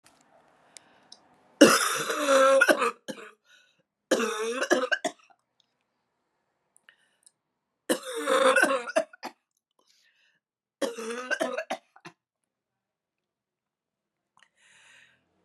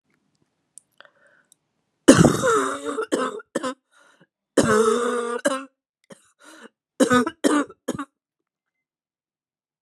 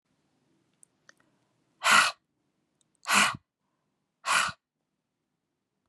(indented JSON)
{
  "three_cough_length": "15.4 s",
  "three_cough_amplitude": 28707,
  "three_cough_signal_mean_std_ratio": 0.35,
  "cough_length": "9.8 s",
  "cough_amplitude": 32767,
  "cough_signal_mean_std_ratio": 0.38,
  "exhalation_length": "5.9 s",
  "exhalation_amplitude": 14318,
  "exhalation_signal_mean_std_ratio": 0.28,
  "survey_phase": "beta (2021-08-13 to 2022-03-07)",
  "age": "18-44",
  "gender": "Female",
  "wearing_mask": "No",
  "symptom_cough_any": true,
  "symptom_runny_or_blocked_nose": true,
  "symptom_fatigue": true,
  "symptom_fever_high_temperature": true,
  "symptom_onset": "3 days",
  "smoker_status": "Never smoked",
  "respiratory_condition_asthma": true,
  "respiratory_condition_other": false,
  "recruitment_source": "Test and Trace",
  "submission_delay": "1 day",
  "covid_test_result": "Positive",
  "covid_test_method": "RT-qPCR",
  "covid_ct_value": 16.7,
  "covid_ct_gene": "ORF1ab gene",
  "covid_ct_mean": 17.3,
  "covid_viral_load": "2100000 copies/ml",
  "covid_viral_load_category": "High viral load (>1M copies/ml)"
}